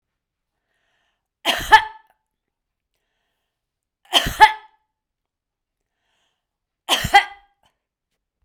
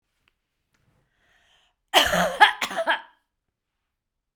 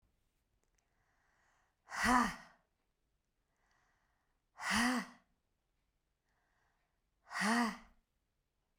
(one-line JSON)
{"three_cough_length": "8.4 s", "three_cough_amplitude": 32768, "three_cough_signal_mean_std_ratio": 0.21, "cough_length": "4.4 s", "cough_amplitude": 32767, "cough_signal_mean_std_ratio": 0.3, "exhalation_length": "8.8 s", "exhalation_amplitude": 4644, "exhalation_signal_mean_std_ratio": 0.3, "survey_phase": "beta (2021-08-13 to 2022-03-07)", "age": "65+", "gender": "Female", "wearing_mask": "No", "symptom_none": true, "smoker_status": "Never smoked", "respiratory_condition_asthma": false, "respiratory_condition_other": false, "recruitment_source": "REACT", "submission_delay": "1 day", "covid_test_result": "Negative", "covid_test_method": "RT-qPCR"}